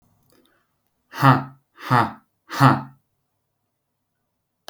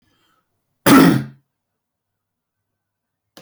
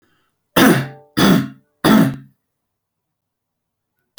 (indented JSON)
{
  "exhalation_length": "4.7 s",
  "exhalation_amplitude": 27350,
  "exhalation_signal_mean_std_ratio": 0.29,
  "cough_length": "3.4 s",
  "cough_amplitude": 31163,
  "cough_signal_mean_std_ratio": 0.27,
  "three_cough_length": "4.2 s",
  "three_cough_amplitude": 32392,
  "three_cough_signal_mean_std_ratio": 0.38,
  "survey_phase": "alpha (2021-03-01 to 2021-08-12)",
  "age": "18-44",
  "gender": "Male",
  "wearing_mask": "No",
  "symptom_none": true,
  "symptom_onset": "2 days",
  "smoker_status": "Never smoked",
  "respiratory_condition_asthma": false,
  "respiratory_condition_other": false,
  "recruitment_source": "Test and Trace",
  "submission_delay": "1 day",
  "covid_test_result": "Positive",
  "covid_test_method": "RT-qPCR",
  "covid_ct_value": 23.3,
  "covid_ct_gene": "ORF1ab gene"
}